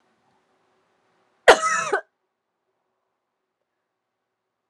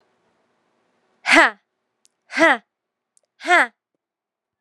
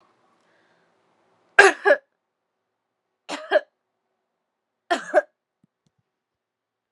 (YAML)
cough_length: 4.7 s
cough_amplitude: 32768
cough_signal_mean_std_ratio: 0.19
exhalation_length: 4.6 s
exhalation_amplitude: 32767
exhalation_signal_mean_std_ratio: 0.27
three_cough_length: 6.9 s
three_cough_amplitude: 32768
three_cough_signal_mean_std_ratio: 0.2
survey_phase: alpha (2021-03-01 to 2021-08-12)
age: 18-44
gender: Female
wearing_mask: 'No'
symptom_cough_any: true
symptom_diarrhoea: true
symptom_change_to_sense_of_smell_or_taste: true
symptom_onset: 8 days
smoker_status: Ex-smoker
respiratory_condition_asthma: false
respiratory_condition_other: false
recruitment_source: Test and Trace
submission_delay: 1 day
covid_test_result: Positive
covid_test_method: RT-qPCR